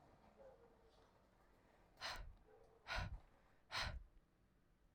{
  "exhalation_length": "4.9 s",
  "exhalation_amplitude": 818,
  "exhalation_signal_mean_std_ratio": 0.45,
  "survey_phase": "beta (2021-08-13 to 2022-03-07)",
  "age": "18-44",
  "gender": "Female",
  "wearing_mask": "No",
  "symptom_runny_or_blocked_nose": true,
  "symptom_change_to_sense_of_smell_or_taste": true,
  "symptom_loss_of_taste": true,
  "symptom_onset": "2 days",
  "smoker_status": "Never smoked",
  "respiratory_condition_asthma": false,
  "respiratory_condition_other": false,
  "recruitment_source": "Test and Trace",
  "submission_delay": "2 days",
  "covid_test_result": "Positive",
  "covid_test_method": "RT-qPCR",
  "covid_ct_value": 15.6,
  "covid_ct_gene": "ORF1ab gene",
  "covid_ct_mean": 15.9,
  "covid_viral_load": "6200000 copies/ml",
  "covid_viral_load_category": "High viral load (>1M copies/ml)"
}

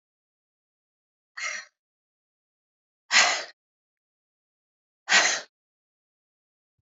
{
  "exhalation_length": "6.8 s",
  "exhalation_amplitude": 20694,
  "exhalation_signal_mean_std_ratio": 0.24,
  "survey_phase": "beta (2021-08-13 to 2022-03-07)",
  "age": "45-64",
  "gender": "Female",
  "wearing_mask": "No",
  "symptom_runny_or_blocked_nose": true,
  "symptom_sore_throat": true,
  "symptom_headache": true,
  "symptom_onset": "2 days",
  "smoker_status": "Never smoked",
  "respiratory_condition_asthma": false,
  "respiratory_condition_other": false,
  "recruitment_source": "REACT",
  "submission_delay": "1 day",
  "covid_test_result": "Negative",
  "covid_test_method": "RT-qPCR",
  "influenza_a_test_result": "Negative",
  "influenza_b_test_result": "Negative"
}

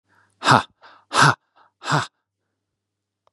{
  "exhalation_length": "3.3 s",
  "exhalation_amplitude": 31657,
  "exhalation_signal_mean_std_ratio": 0.3,
  "survey_phase": "beta (2021-08-13 to 2022-03-07)",
  "age": "18-44",
  "gender": "Male",
  "wearing_mask": "No",
  "symptom_none": true,
  "smoker_status": "Never smoked",
  "respiratory_condition_asthma": false,
  "respiratory_condition_other": false,
  "recruitment_source": "REACT",
  "submission_delay": "0 days",
  "covid_test_result": "Negative",
  "covid_test_method": "RT-qPCR",
  "influenza_a_test_result": "Negative",
  "influenza_b_test_result": "Negative"
}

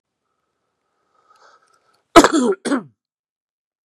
{
  "cough_length": "3.8 s",
  "cough_amplitude": 32768,
  "cough_signal_mean_std_ratio": 0.24,
  "survey_phase": "beta (2021-08-13 to 2022-03-07)",
  "age": "45-64",
  "gender": "Male",
  "wearing_mask": "No",
  "symptom_cough_any": true,
  "symptom_runny_or_blocked_nose": true,
  "symptom_fatigue": true,
  "symptom_headache": true,
  "symptom_change_to_sense_of_smell_or_taste": true,
  "symptom_onset": "4 days",
  "smoker_status": "Never smoked",
  "respiratory_condition_asthma": false,
  "respiratory_condition_other": false,
  "recruitment_source": "Test and Trace",
  "submission_delay": "2 days",
  "covid_test_result": "Positive",
  "covid_test_method": "ePCR"
}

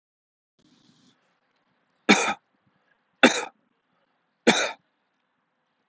{
  "three_cough_length": "5.9 s",
  "three_cough_amplitude": 27439,
  "three_cough_signal_mean_std_ratio": 0.23,
  "survey_phase": "alpha (2021-03-01 to 2021-08-12)",
  "age": "45-64",
  "gender": "Male",
  "wearing_mask": "No",
  "symptom_none": true,
  "smoker_status": "Never smoked",
  "respiratory_condition_asthma": false,
  "respiratory_condition_other": false,
  "recruitment_source": "REACT",
  "submission_delay": "2 days",
  "covid_test_result": "Negative",
  "covid_test_method": "RT-qPCR"
}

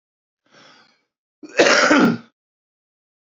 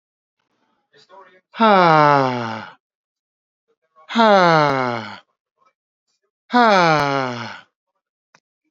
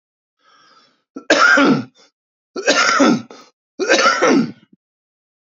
{
  "cough_length": "3.3 s",
  "cough_amplitude": 30073,
  "cough_signal_mean_std_ratio": 0.35,
  "exhalation_length": "8.7 s",
  "exhalation_amplitude": 29545,
  "exhalation_signal_mean_std_ratio": 0.42,
  "three_cough_length": "5.5 s",
  "three_cough_amplitude": 32768,
  "three_cough_signal_mean_std_ratio": 0.49,
  "survey_phase": "beta (2021-08-13 to 2022-03-07)",
  "age": "45-64",
  "gender": "Male",
  "wearing_mask": "No",
  "symptom_cough_any": true,
  "symptom_runny_or_blocked_nose": true,
  "symptom_shortness_of_breath": true,
  "symptom_abdominal_pain": true,
  "symptom_diarrhoea": true,
  "symptom_onset": "12 days",
  "smoker_status": "Current smoker (1 to 10 cigarettes per day)",
  "respiratory_condition_asthma": true,
  "respiratory_condition_other": true,
  "recruitment_source": "REACT",
  "submission_delay": "3 days",
  "covid_test_result": "Negative",
  "covid_test_method": "RT-qPCR",
  "influenza_a_test_result": "Negative",
  "influenza_b_test_result": "Negative"
}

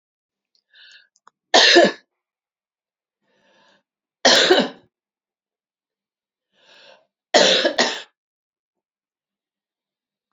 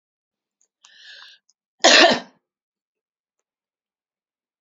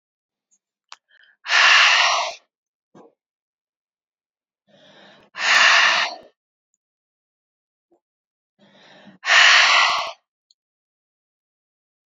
{
  "three_cough_length": "10.3 s",
  "three_cough_amplitude": 32767,
  "three_cough_signal_mean_std_ratio": 0.28,
  "cough_length": "4.6 s",
  "cough_amplitude": 30828,
  "cough_signal_mean_std_ratio": 0.22,
  "exhalation_length": "12.1 s",
  "exhalation_amplitude": 27804,
  "exhalation_signal_mean_std_ratio": 0.36,
  "survey_phase": "beta (2021-08-13 to 2022-03-07)",
  "age": "45-64",
  "gender": "Female",
  "wearing_mask": "No",
  "symptom_cough_any": true,
  "symptom_runny_or_blocked_nose": true,
  "symptom_sore_throat": true,
  "symptom_fatigue": true,
  "smoker_status": "Never smoked",
  "respiratory_condition_asthma": false,
  "respiratory_condition_other": false,
  "recruitment_source": "REACT",
  "submission_delay": "2 days",
  "covid_test_result": "Positive",
  "covid_test_method": "RT-qPCR",
  "covid_ct_value": 21.0,
  "covid_ct_gene": "E gene",
  "influenza_a_test_result": "Negative",
  "influenza_b_test_result": "Negative"
}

